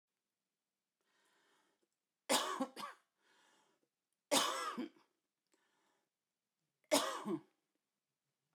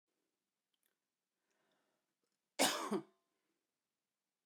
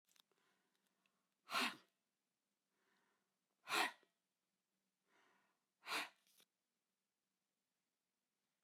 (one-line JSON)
{"three_cough_length": "8.5 s", "three_cough_amplitude": 4510, "three_cough_signal_mean_std_ratio": 0.3, "cough_length": "4.5 s", "cough_amplitude": 4440, "cough_signal_mean_std_ratio": 0.22, "exhalation_length": "8.6 s", "exhalation_amplitude": 1501, "exhalation_signal_mean_std_ratio": 0.22, "survey_phase": "beta (2021-08-13 to 2022-03-07)", "age": "45-64", "gender": "Female", "wearing_mask": "No", "symptom_none": true, "smoker_status": "Ex-smoker", "respiratory_condition_asthma": false, "respiratory_condition_other": false, "recruitment_source": "REACT", "submission_delay": "2 days", "covid_test_result": "Negative", "covid_test_method": "RT-qPCR"}